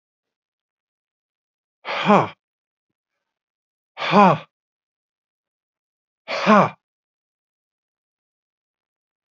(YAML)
exhalation_length: 9.3 s
exhalation_amplitude: 27545
exhalation_signal_mean_std_ratio: 0.23
survey_phase: beta (2021-08-13 to 2022-03-07)
age: 45-64
gender: Male
wearing_mask: 'No'
symptom_runny_or_blocked_nose: true
symptom_fatigue: true
smoker_status: Current smoker (1 to 10 cigarettes per day)
respiratory_condition_asthma: false
respiratory_condition_other: false
recruitment_source: REACT
submission_delay: 1 day
covid_test_result: Negative
covid_test_method: RT-qPCR
influenza_a_test_result: Negative
influenza_b_test_result: Negative